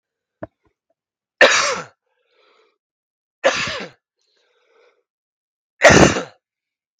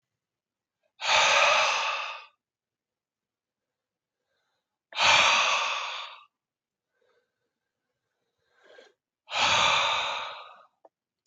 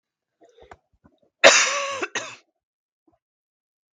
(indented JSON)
{
  "three_cough_length": "7.0 s",
  "three_cough_amplitude": 32768,
  "three_cough_signal_mean_std_ratio": 0.28,
  "exhalation_length": "11.3 s",
  "exhalation_amplitude": 12221,
  "exhalation_signal_mean_std_ratio": 0.42,
  "cough_length": "3.9 s",
  "cough_amplitude": 32768,
  "cough_signal_mean_std_ratio": 0.26,
  "survey_phase": "beta (2021-08-13 to 2022-03-07)",
  "age": "18-44",
  "gender": "Male",
  "wearing_mask": "No",
  "symptom_runny_or_blocked_nose": true,
  "symptom_loss_of_taste": true,
  "symptom_onset": "4 days",
  "smoker_status": "Never smoked",
  "respiratory_condition_asthma": false,
  "respiratory_condition_other": false,
  "recruitment_source": "Test and Trace",
  "submission_delay": "2 days",
  "covid_test_result": "Positive",
  "covid_test_method": "RT-qPCR",
  "covid_ct_value": 18.0,
  "covid_ct_gene": "ORF1ab gene",
  "covid_ct_mean": 18.3,
  "covid_viral_load": "970000 copies/ml",
  "covid_viral_load_category": "Low viral load (10K-1M copies/ml)"
}